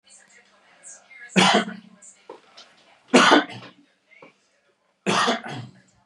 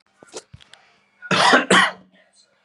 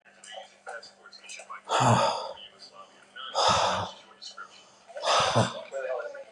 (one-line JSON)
{"three_cough_length": "6.1 s", "three_cough_amplitude": 29744, "three_cough_signal_mean_std_ratio": 0.34, "cough_length": "2.6 s", "cough_amplitude": 31438, "cough_signal_mean_std_ratio": 0.38, "exhalation_length": "6.3 s", "exhalation_amplitude": 10966, "exhalation_signal_mean_std_ratio": 0.53, "survey_phase": "beta (2021-08-13 to 2022-03-07)", "age": "45-64", "gender": "Male", "wearing_mask": "No", "symptom_none": true, "smoker_status": "Never smoked", "respiratory_condition_asthma": false, "respiratory_condition_other": false, "recruitment_source": "REACT", "submission_delay": "1 day", "covid_test_result": "Negative", "covid_test_method": "RT-qPCR", "influenza_a_test_result": "Negative", "influenza_b_test_result": "Negative"}